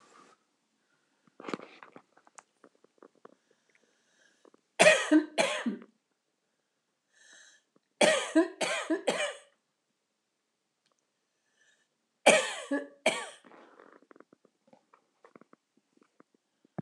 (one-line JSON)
{"three_cough_length": "16.8 s", "three_cough_amplitude": 15964, "three_cough_signal_mean_std_ratio": 0.27, "survey_phase": "beta (2021-08-13 to 2022-03-07)", "age": "65+", "gender": "Female", "wearing_mask": "No", "symptom_cough_any": true, "symptom_shortness_of_breath": true, "symptom_diarrhoea": true, "symptom_change_to_sense_of_smell_or_taste": true, "symptom_loss_of_taste": true, "smoker_status": "Never smoked", "respiratory_condition_asthma": false, "respiratory_condition_other": true, "recruitment_source": "REACT", "submission_delay": "8 days", "covid_test_result": "Negative", "covid_test_method": "RT-qPCR", "influenza_a_test_result": "Negative", "influenza_b_test_result": "Negative"}